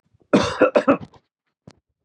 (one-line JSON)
{"cough_length": "2.0 s", "cough_amplitude": 25982, "cough_signal_mean_std_ratio": 0.37, "survey_phase": "beta (2021-08-13 to 2022-03-07)", "age": "45-64", "gender": "Male", "wearing_mask": "No", "symptom_cough_any": true, "symptom_runny_or_blocked_nose": true, "symptom_fatigue": true, "symptom_fever_high_temperature": true, "symptom_headache": true, "symptom_loss_of_taste": true, "symptom_onset": "7 days", "smoker_status": "Never smoked", "respiratory_condition_asthma": false, "respiratory_condition_other": false, "recruitment_source": "Test and Trace", "submission_delay": "5 days", "covid_test_result": "Positive", "covid_test_method": "RT-qPCR", "covid_ct_value": 17.3, "covid_ct_gene": "N gene", "covid_ct_mean": 18.1, "covid_viral_load": "1200000 copies/ml", "covid_viral_load_category": "High viral load (>1M copies/ml)"}